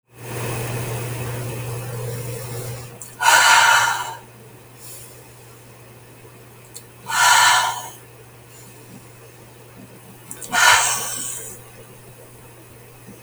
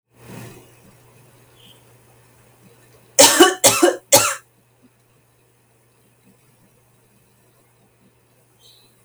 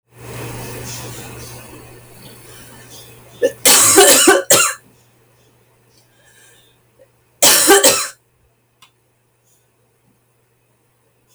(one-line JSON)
{"exhalation_length": "13.2 s", "exhalation_amplitude": 32766, "exhalation_signal_mean_std_ratio": 0.48, "three_cough_length": "9.0 s", "three_cough_amplitude": 32768, "three_cough_signal_mean_std_ratio": 0.24, "cough_length": "11.3 s", "cough_amplitude": 32768, "cough_signal_mean_std_ratio": 0.36, "survey_phase": "beta (2021-08-13 to 2022-03-07)", "age": "45-64", "gender": "Female", "wearing_mask": "No", "symptom_new_continuous_cough": true, "symptom_runny_or_blocked_nose": true, "symptom_fatigue": true, "symptom_onset": "3 days", "smoker_status": "Never smoked", "respiratory_condition_asthma": false, "respiratory_condition_other": false, "recruitment_source": "Test and Trace", "submission_delay": "2 days", "covid_test_result": "Positive", "covid_test_method": "RT-qPCR", "covid_ct_value": 17.9, "covid_ct_gene": "ORF1ab gene", "covid_ct_mean": 18.2, "covid_viral_load": "1000000 copies/ml", "covid_viral_load_category": "High viral load (>1M copies/ml)"}